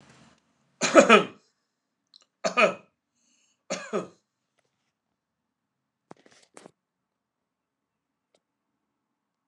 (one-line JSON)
{"cough_length": "9.5 s", "cough_amplitude": 29203, "cough_signal_mean_std_ratio": 0.19, "survey_phase": "alpha (2021-03-01 to 2021-08-12)", "age": "65+", "gender": "Male", "wearing_mask": "No", "symptom_none": true, "smoker_status": "Never smoked", "respiratory_condition_asthma": true, "respiratory_condition_other": false, "recruitment_source": "REACT", "submission_delay": "3 days", "covid_test_result": "Negative", "covid_test_method": "RT-qPCR"}